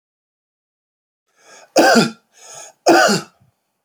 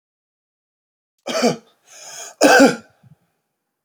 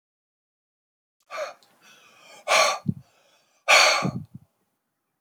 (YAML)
three_cough_length: 3.8 s
three_cough_amplitude: 29706
three_cough_signal_mean_std_ratio: 0.36
cough_length: 3.8 s
cough_amplitude: 32360
cough_signal_mean_std_ratio: 0.31
exhalation_length: 5.2 s
exhalation_amplitude: 23601
exhalation_signal_mean_std_ratio: 0.33
survey_phase: beta (2021-08-13 to 2022-03-07)
age: 45-64
gender: Male
wearing_mask: 'No'
symptom_none: true
smoker_status: Never smoked
respiratory_condition_asthma: false
respiratory_condition_other: false
recruitment_source: REACT
submission_delay: 1 day
covid_test_result: Negative
covid_test_method: RT-qPCR